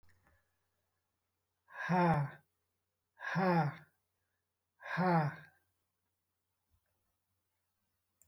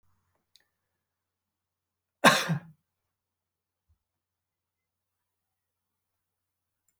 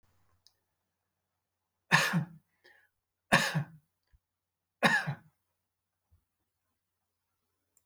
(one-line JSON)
{"exhalation_length": "8.3 s", "exhalation_amplitude": 3723, "exhalation_signal_mean_std_ratio": 0.34, "cough_length": "7.0 s", "cough_amplitude": 23603, "cough_signal_mean_std_ratio": 0.15, "three_cough_length": "7.9 s", "three_cough_amplitude": 11246, "three_cough_signal_mean_std_ratio": 0.26, "survey_phase": "alpha (2021-03-01 to 2021-08-12)", "age": "65+", "gender": "Male", "wearing_mask": "No", "symptom_none": true, "smoker_status": "Never smoked", "respiratory_condition_asthma": false, "respiratory_condition_other": false, "recruitment_source": "REACT", "submission_delay": "2 days", "covid_test_result": "Negative", "covid_test_method": "RT-qPCR"}